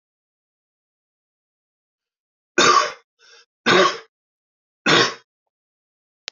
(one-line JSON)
{"three_cough_length": "6.3 s", "three_cough_amplitude": 26317, "three_cough_signal_mean_std_ratio": 0.29, "survey_phase": "beta (2021-08-13 to 2022-03-07)", "age": "18-44", "gender": "Male", "wearing_mask": "No", "symptom_none": true, "symptom_onset": "12 days", "smoker_status": "Never smoked", "respiratory_condition_asthma": false, "respiratory_condition_other": false, "recruitment_source": "REACT", "submission_delay": "2 days", "covid_test_result": "Negative", "covid_test_method": "RT-qPCR", "influenza_a_test_result": "Negative", "influenza_b_test_result": "Negative"}